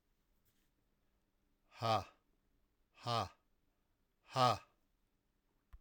exhalation_length: 5.8 s
exhalation_amplitude: 3552
exhalation_signal_mean_std_ratio: 0.27
survey_phase: alpha (2021-03-01 to 2021-08-12)
age: 45-64
gender: Male
wearing_mask: 'No'
symptom_loss_of_taste: true
symptom_onset: 3 days
smoker_status: Never smoked
respiratory_condition_asthma: false
respiratory_condition_other: false
recruitment_source: Test and Trace
submission_delay: 1 day
covid_test_result: Positive
covid_test_method: RT-qPCR
covid_ct_value: 16.4
covid_ct_gene: ORF1ab gene
covid_ct_mean: 16.8
covid_viral_load: 3100000 copies/ml
covid_viral_load_category: High viral load (>1M copies/ml)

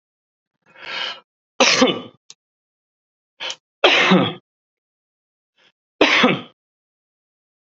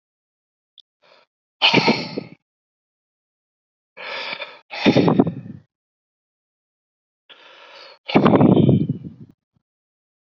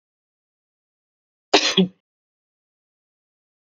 three_cough_length: 7.7 s
three_cough_amplitude: 30274
three_cough_signal_mean_std_ratio: 0.34
exhalation_length: 10.3 s
exhalation_amplitude: 32768
exhalation_signal_mean_std_ratio: 0.34
cough_length: 3.7 s
cough_amplitude: 27939
cough_signal_mean_std_ratio: 0.21
survey_phase: beta (2021-08-13 to 2022-03-07)
age: 45-64
gender: Male
wearing_mask: 'No'
symptom_none: true
smoker_status: Current smoker (1 to 10 cigarettes per day)
respiratory_condition_asthma: false
respiratory_condition_other: false
recruitment_source: REACT
submission_delay: 1 day
covid_test_result: Negative
covid_test_method: RT-qPCR
influenza_a_test_result: Unknown/Void
influenza_b_test_result: Unknown/Void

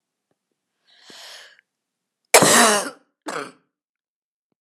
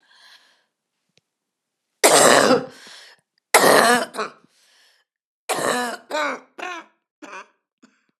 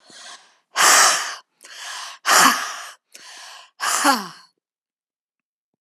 cough_length: 4.6 s
cough_amplitude: 32768
cough_signal_mean_std_ratio: 0.28
three_cough_length: 8.2 s
three_cough_amplitude: 32767
three_cough_signal_mean_std_ratio: 0.36
exhalation_length: 5.8 s
exhalation_amplitude: 31914
exhalation_signal_mean_std_ratio: 0.41
survey_phase: beta (2021-08-13 to 2022-03-07)
age: 45-64
gender: Female
wearing_mask: 'No'
symptom_cough_any: true
symptom_new_continuous_cough: true
symptom_shortness_of_breath: true
symptom_sore_throat: true
symptom_fatigue: true
symptom_headache: true
symptom_change_to_sense_of_smell_or_taste: true
smoker_status: Never smoked
respiratory_condition_asthma: false
respiratory_condition_other: false
recruitment_source: Test and Trace
submission_delay: 1 day
covid_test_result: Positive
covid_test_method: RT-qPCR
covid_ct_value: 18.8
covid_ct_gene: ORF1ab gene
covid_ct_mean: 18.9
covid_viral_load: 640000 copies/ml
covid_viral_load_category: Low viral load (10K-1M copies/ml)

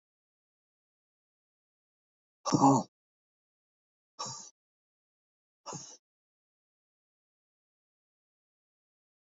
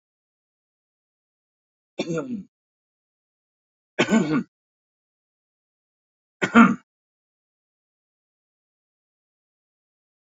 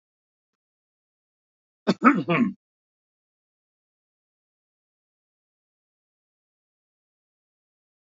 exhalation_length: 9.4 s
exhalation_amplitude: 8974
exhalation_signal_mean_std_ratio: 0.17
three_cough_length: 10.3 s
three_cough_amplitude: 27336
three_cough_signal_mean_std_ratio: 0.21
cough_length: 8.0 s
cough_amplitude: 25574
cough_signal_mean_std_ratio: 0.18
survey_phase: beta (2021-08-13 to 2022-03-07)
age: 65+
gender: Male
wearing_mask: 'No'
symptom_none: true
smoker_status: Ex-smoker
respiratory_condition_asthma: false
respiratory_condition_other: false
recruitment_source: REACT
submission_delay: 4 days
covid_test_result: Negative
covid_test_method: RT-qPCR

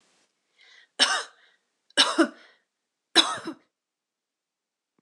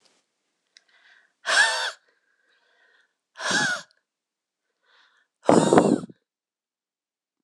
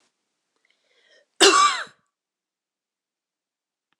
three_cough_length: 5.0 s
three_cough_amplitude: 22689
three_cough_signal_mean_std_ratio: 0.27
exhalation_length: 7.4 s
exhalation_amplitude: 26028
exhalation_signal_mean_std_ratio: 0.3
cough_length: 4.0 s
cough_amplitude: 26028
cough_signal_mean_std_ratio: 0.24
survey_phase: beta (2021-08-13 to 2022-03-07)
age: 18-44
gender: Female
wearing_mask: 'No'
symptom_none: true
smoker_status: Never smoked
respiratory_condition_asthma: false
respiratory_condition_other: false
recruitment_source: REACT
submission_delay: 1 day
covid_test_result: Negative
covid_test_method: RT-qPCR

